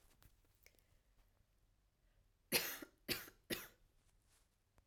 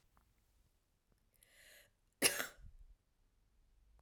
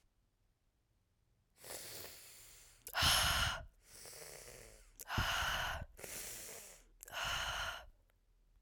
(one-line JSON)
{"three_cough_length": "4.9 s", "three_cough_amplitude": 2754, "three_cough_signal_mean_std_ratio": 0.28, "cough_length": "4.0 s", "cough_amplitude": 5358, "cough_signal_mean_std_ratio": 0.21, "exhalation_length": "8.6 s", "exhalation_amplitude": 3438, "exhalation_signal_mean_std_ratio": 0.5, "survey_phase": "alpha (2021-03-01 to 2021-08-12)", "age": "18-44", "gender": "Female", "wearing_mask": "No", "symptom_cough_any": true, "symptom_fever_high_temperature": true, "symptom_change_to_sense_of_smell_or_taste": true, "symptom_loss_of_taste": true, "smoker_status": "Ex-smoker", "respiratory_condition_asthma": false, "respiratory_condition_other": false, "recruitment_source": "Test and Trace", "submission_delay": "2 days", "covid_test_result": "Positive", "covid_test_method": "RT-qPCR"}